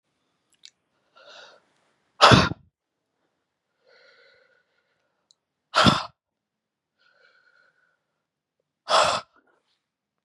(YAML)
exhalation_length: 10.2 s
exhalation_amplitude: 31653
exhalation_signal_mean_std_ratio: 0.21
survey_phase: beta (2021-08-13 to 2022-03-07)
age: 45-64
gender: Female
wearing_mask: 'No'
symptom_cough_any: true
symptom_runny_or_blocked_nose: true
symptom_shortness_of_breath: true
symptom_sore_throat: true
symptom_fatigue: true
symptom_fever_high_temperature: true
symptom_headache: true
symptom_loss_of_taste: true
symptom_onset: 5 days
smoker_status: Never smoked
respiratory_condition_asthma: false
respiratory_condition_other: false
recruitment_source: Test and Trace
submission_delay: 2 days
covid_test_result: Positive
covid_test_method: RT-qPCR
covid_ct_value: 16.5
covid_ct_gene: ORF1ab gene
covid_ct_mean: 16.7
covid_viral_load: 3200000 copies/ml
covid_viral_load_category: High viral load (>1M copies/ml)